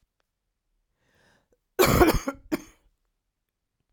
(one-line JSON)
{"cough_length": "3.9 s", "cough_amplitude": 19141, "cough_signal_mean_std_ratio": 0.28, "survey_phase": "alpha (2021-03-01 to 2021-08-12)", "age": "45-64", "gender": "Female", "wearing_mask": "No", "symptom_new_continuous_cough": true, "symptom_shortness_of_breath": true, "symptom_abdominal_pain": true, "symptom_diarrhoea": true, "symptom_fatigue": true, "symptom_fever_high_temperature": true, "symptom_headache": true, "smoker_status": "Never smoked", "respiratory_condition_asthma": false, "respiratory_condition_other": false, "recruitment_source": "Test and Trace", "submission_delay": "2 days", "covid_test_result": "Positive", "covid_test_method": "RT-qPCR", "covid_ct_value": 17.6, "covid_ct_gene": "ORF1ab gene", "covid_ct_mean": 18.1, "covid_viral_load": "1100000 copies/ml", "covid_viral_load_category": "High viral load (>1M copies/ml)"}